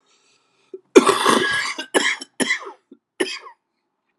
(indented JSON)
{
  "cough_length": "4.2 s",
  "cough_amplitude": 32768,
  "cough_signal_mean_std_ratio": 0.4,
  "survey_phase": "alpha (2021-03-01 to 2021-08-12)",
  "age": "45-64",
  "gender": "Male",
  "wearing_mask": "No",
  "symptom_cough_any": true,
  "symptom_fatigue": true,
  "symptom_headache": true,
  "symptom_onset": "64 days",
  "smoker_status": "Never smoked",
  "respiratory_condition_asthma": false,
  "respiratory_condition_other": false,
  "recruitment_source": "Test and Trace",
  "submission_delay": "2 days",
  "covid_test_result": "Positive",
  "covid_test_method": "ePCR"
}